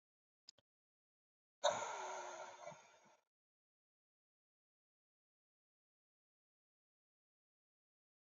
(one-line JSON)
{"exhalation_length": "8.4 s", "exhalation_amplitude": 2540, "exhalation_signal_mean_std_ratio": 0.22, "survey_phase": "alpha (2021-03-01 to 2021-08-12)", "age": "18-44", "gender": "Male", "wearing_mask": "No", "symptom_cough_any": true, "symptom_fatigue": true, "symptom_fever_high_temperature": true, "symptom_headache": true, "symptom_change_to_sense_of_smell_or_taste": true, "symptom_loss_of_taste": true, "symptom_onset": "3 days", "smoker_status": "Current smoker (e-cigarettes or vapes only)", "respiratory_condition_asthma": false, "respiratory_condition_other": false, "recruitment_source": "Test and Trace", "submission_delay": "2 days", "covid_test_result": "Positive", "covid_test_method": "RT-qPCR", "covid_ct_value": 11.9, "covid_ct_gene": "ORF1ab gene", "covid_ct_mean": 12.3, "covid_viral_load": "96000000 copies/ml", "covid_viral_load_category": "High viral load (>1M copies/ml)"}